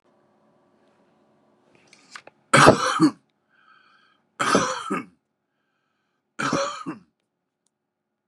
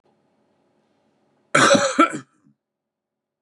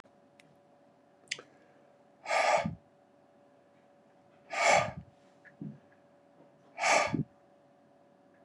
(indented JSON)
{
  "three_cough_length": "8.3 s",
  "three_cough_amplitude": 32768,
  "three_cough_signal_mean_std_ratio": 0.29,
  "cough_length": "3.4 s",
  "cough_amplitude": 31680,
  "cough_signal_mean_std_ratio": 0.31,
  "exhalation_length": "8.4 s",
  "exhalation_amplitude": 7755,
  "exhalation_signal_mean_std_ratio": 0.34,
  "survey_phase": "beta (2021-08-13 to 2022-03-07)",
  "age": "45-64",
  "gender": "Male",
  "wearing_mask": "No",
  "symptom_none": true,
  "smoker_status": "Current smoker (11 or more cigarettes per day)",
  "respiratory_condition_asthma": false,
  "respiratory_condition_other": false,
  "recruitment_source": "REACT",
  "submission_delay": "1 day",
  "covid_test_result": "Negative",
  "covid_test_method": "RT-qPCR",
  "influenza_a_test_result": "Negative",
  "influenza_b_test_result": "Negative"
}